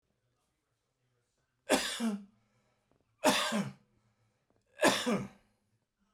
three_cough_length: 6.1 s
three_cough_amplitude: 8243
three_cough_signal_mean_std_ratio: 0.36
survey_phase: beta (2021-08-13 to 2022-03-07)
age: 65+
gender: Male
wearing_mask: 'No'
symptom_none: true
smoker_status: Never smoked
respiratory_condition_asthma: false
respiratory_condition_other: false
recruitment_source: REACT
covid_test_method: RT-qPCR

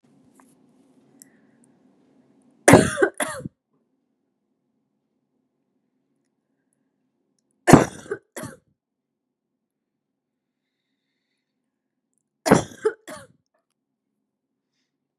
three_cough_length: 15.2 s
three_cough_amplitude: 32768
three_cough_signal_mean_std_ratio: 0.17
survey_phase: beta (2021-08-13 to 2022-03-07)
age: 18-44
gender: Female
wearing_mask: 'No'
symptom_cough_any: true
symptom_runny_or_blocked_nose: true
symptom_sore_throat: true
symptom_change_to_sense_of_smell_or_taste: true
symptom_other: true
symptom_onset: 3 days
smoker_status: Never smoked
respiratory_condition_asthma: false
respiratory_condition_other: false
recruitment_source: Test and Trace
submission_delay: 1 day
covid_test_result: Positive
covid_test_method: ePCR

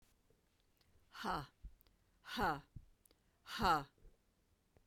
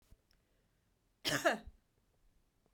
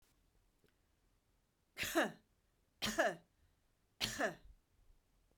exhalation_length: 4.9 s
exhalation_amplitude: 2635
exhalation_signal_mean_std_ratio: 0.34
cough_length: 2.7 s
cough_amplitude: 4190
cough_signal_mean_std_ratio: 0.26
three_cough_length: 5.4 s
three_cough_amplitude: 2991
three_cough_signal_mean_std_ratio: 0.33
survey_phase: beta (2021-08-13 to 2022-03-07)
age: 65+
gender: Female
wearing_mask: 'No'
symptom_none: true
symptom_onset: 4 days
smoker_status: Never smoked
respiratory_condition_asthma: false
respiratory_condition_other: false
recruitment_source: REACT
submission_delay: 5 days
covid_test_result: Negative
covid_test_method: RT-qPCR
influenza_a_test_result: Negative
influenza_b_test_result: Negative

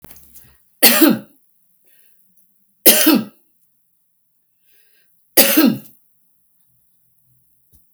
three_cough_length: 7.9 s
three_cough_amplitude: 32768
three_cough_signal_mean_std_ratio: 0.3
survey_phase: alpha (2021-03-01 to 2021-08-12)
age: 65+
gender: Female
wearing_mask: 'No'
symptom_none: true
smoker_status: Ex-smoker
respiratory_condition_asthma: false
respiratory_condition_other: false
recruitment_source: REACT
submission_delay: 2 days
covid_test_result: Negative
covid_test_method: RT-qPCR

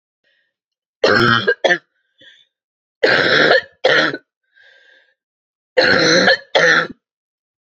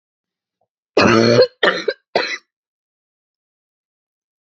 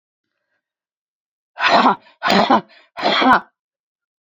three_cough_length: 7.7 s
three_cough_amplitude: 32768
three_cough_signal_mean_std_ratio: 0.47
cough_length: 4.5 s
cough_amplitude: 30820
cough_signal_mean_std_ratio: 0.33
exhalation_length: 4.3 s
exhalation_amplitude: 29935
exhalation_signal_mean_std_ratio: 0.4
survey_phase: beta (2021-08-13 to 2022-03-07)
age: 45-64
gender: Female
wearing_mask: 'No'
symptom_cough_any: true
symptom_runny_or_blocked_nose: true
symptom_shortness_of_breath: true
symptom_fatigue: true
symptom_headache: true
symptom_onset: 4 days
smoker_status: Never smoked
respiratory_condition_asthma: true
respiratory_condition_other: false
recruitment_source: Test and Trace
submission_delay: 2 days
covid_test_result: Positive
covid_test_method: ePCR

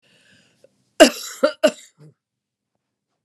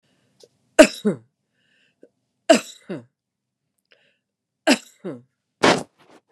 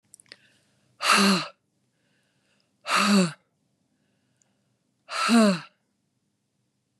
cough_length: 3.2 s
cough_amplitude: 32768
cough_signal_mean_std_ratio: 0.22
three_cough_length: 6.3 s
three_cough_amplitude: 32768
three_cough_signal_mean_std_ratio: 0.23
exhalation_length: 7.0 s
exhalation_amplitude: 15601
exhalation_signal_mean_std_ratio: 0.35
survey_phase: beta (2021-08-13 to 2022-03-07)
age: 65+
gender: Female
wearing_mask: 'No'
symptom_none: true
smoker_status: Never smoked
respiratory_condition_asthma: false
respiratory_condition_other: false
recruitment_source: REACT
submission_delay: 2 days
covid_test_result: Negative
covid_test_method: RT-qPCR
influenza_a_test_result: Negative
influenza_b_test_result: Negative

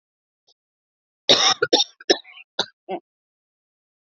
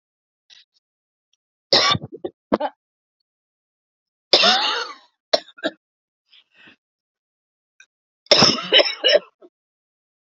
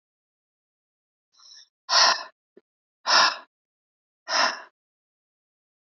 cough_length: 4.1 s
cough_amplitude: 31275
cough_signal_mean_std_ratio: 0.28
three_cough_length: 10.2 s
three_cough_amplitude: 29989
three_cough_signal_mean_std_ratio: 0.3
exhalation_length: 6.0 s
exhalation_amplitude: 18153
exhalation_signal_mean_std_ratio: 0.29
survey_phase: beta (2021-08-13 to 2022-03-07)
age: 45-64
gender: Female
wearing_mask: 'No'
symptom_cough_any: true
symptom_runny_or_blocked_nose: true
symptom_sore_throat: true
symptom_headache: true
symptom_onset: 4 days
smoker_status: Ex-smoker
respiratory_condition_asthma: false
respiratory_condition_other: false
recruitment_source: Test and Trace
submission_delay: 0 days
covid_test_result: Positive
covid_test_method: RT-qPCR
covid_ct_value: 23.1
covid_ct_gene: ORF1ab gene
covid_ct_mean: 23.8
covid_viral_load: 16000 copies/ml
covid_viral_load_category: Low viral load (10K-1M copies/ml)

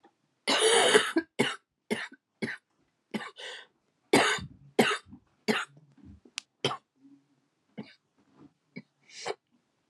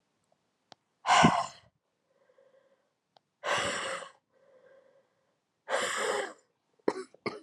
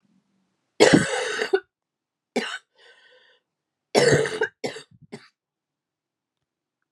cough_length: 9.9 s
cough_amplitude: 14964
cough_signal_mean_std_ratio: 0.35
exhalation_length: 7.4 s
exhalation_amplitude: 12465
exhalation_signal_mean_std_ratio: 0.34
three_cough_length: 6.9 s
three_cough_amplitude: 32184
three_cough_signal_mean_std_ratio: 0.32
survey_phase: alpha (2021-03-01 to 2021-08-12)
age: 18-44
gender: Female
wearing_mask: 'No'
symptom_cough_any: true
symptom_shortness_of_breath: true
symptom_diarrhoea: true
symptom_change_to_sense_of_smell_or_taste: true
smoker_status: Never smoked
respiratory_condition_asthma: false
respiratory_condition_other: false
recruitment_source: Test and Trace
submission_delay: 5 days
covid_test_result: Positive
covid_test_method: LFT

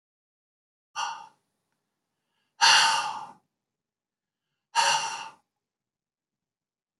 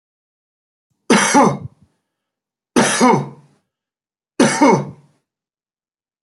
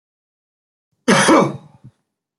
exhalation_length: 7.0 s
exhalation_amplitude: 15030
exhalation_signal_mean_std_ratio: 0.3
three_cough_length: 6.2 s
three_cough_amplitude: 30253
three_cough_signal_mean_std_ratio: 0.38
cough_length: 2.4 s
cough_amplitude: 27863
cough_signal_mean_std_ratio: 0.35
survey_phase: beta (2021-08-13 to 2022-03-07)
age: 65+
gender: Male
wearing_mask: 'No'
symptom_none: true
smoker_status: Never smoked
respiratory_condition_asthma: false
respiratory_condition_other: false
recruitment_source: REACT
submission_delay: 2 days
covid_test_result: Negative
covid_test_method: RT-qPCR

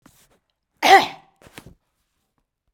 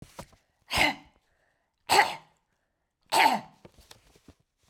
cough_length: 2.7 s
cough_amplitude: 32102
cough_signal_mean_std_ratio: 0.23
three_cough_length: 4.7 s
three_cough_amplitude: 15524
three_cough_signal_mean_std_ratio: 0.31
survey_phase: beta (2021-08-13 to 2022-03-07)
age: 65+
gender: Female
wearing_mask: 'No'
symptom_none: true
symptom_onset: 13 days
smoker_status: Ex-smoker
respiratory_condition_asthma: false
respiratory_condition_other: false
recruitment_source: REACT
submission_delay: 1 day
covid_test_result: Negative
covid_test_method: RT-qPCR
influenza_a_test_result: Unknown/Void
influenza_b_test_result: Unknown/Void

